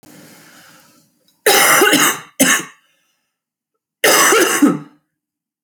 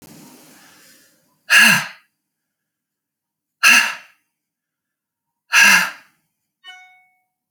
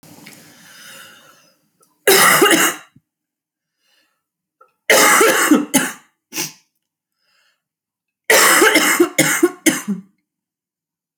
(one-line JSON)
{"cough_length": "5.6 s", "cough_amplitude": 32768, "cough_signal_mean_std_ratio": 0.46, "exhalation_length": "7.5 s", "exhalation_amplitude": 32767, "exhalation_signal_mean_std_ratio": 0.3, "three_cough_length": "11.2 s", "three_cough_amplitude": 32768, "three_cough_signal_mean_std_ratio": 0.42, "survey_phase": "alpha (2021-03-01 to 2021-08-12)", "age": "45-64", "gender": "Female", "wearing_mask": "No", "symptom_cough_any": true, "symptom_onset": "11 days", "smoker_status": "Ex-smoker", "respiratory_condition_asthma": true, "respiratory_condition_other": false, "recruitment_source": "REACT", "submission_delay": "3 days", "covid_test_result": "Negative", "covid_test_method": "RT-qPCR"}